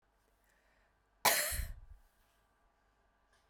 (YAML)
cough_length: 3.5 s
cough_amplitude: 6573
cough_signal_mean_std_ratio: 0.28
survey_phase: beta (2021-08-13 to 2022-03-07)
age: 18-44
gender: Female
wearing_mask: 'No'
symptom_cough_any: true
symptom_runny_or_blocked_nose: true
symptom_fatigue: true
symptom_headache: true
symptom_change_to_sense_of_smell_or_taste: true
symptom_loss_of_taste: true
symptom_onset: 14 days
smoker_status: Never smoked
respiratory_condition_asthma: false
respiratory_condition_other: false
recruitment_source: Test and Trace
submission_delay: 12 days
covid_test_result: Negative
covid_test_method: RT-qPCR